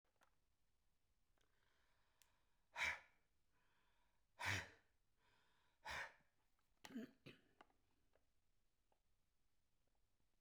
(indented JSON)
{
  "exhalation_length": "10.4 s",
  "exhalation_amplitude": 910,
  "exhalation_signal_mean_std_ratio": 0.28,
  "survey_phase": "beta (2021-08-13 to 2022-03-07)",
  "age": "65+",
  "gender": "Male",
  "wearing_mask": "No",
  "symptom_none": true,
  "smoker_status": "Never smoked",
  "respiratory_condition_asthma": false,
  "respiratory_condition_other": false,
  "recruitment_source": "REACT",
  "submission_delay": "1 day",
  "covid_test_result": "Negative",
  "covid_test_method": "RT-qPCR"
}